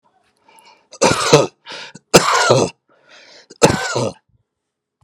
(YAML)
cough_length: 5.0 s
cough_amplitude: 32768
cough_signal_mean_std_ratio: 0.4
survey_phase: alpha (2021-03-01 to 2021-08-12)
age: 65+
gender: Male
wearing_mask: 'No'
symptom_none: true
smoker_status: Ex-smoker
respiratory_condition_asthma: false
respiratory_condition_other: false
recruitment_source: REACT
submission_delay: 2 days
covid_test_result: Negative
covid_test_method: RT-qPCR